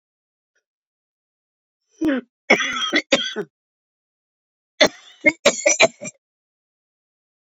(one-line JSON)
{"cough_length": "7.5 s", "cough_amplitude": 31519, "cough_signal_mean_std_ratio": 0.31, "survey_phase": "beta (2021-08-13 to 2022-03-07)", "age": "45-64", "gender": "Female", "wearing_mask": "No", "symptom_cough_any": true, "symptom_runny_or_blocked_nose": true, "symptom_sore_throat": true, "symptom_diarrhoea": true, "symptom_fatigue": true, "symptom_other": true, "smoker_status": "Current smoker (1 to 10 cigarettes per day)", "respiratory_condition_asthma": false, "respiratory_condition_other": false, "recruitment_source": "Test and Trace", "submission_delay": "2 days", "covid_test_result": "Positive", "covid_test_method": "RT-qPCR", "covid_ct_value": 33.9, "covid_ct_gene": "ORF1ab gene"}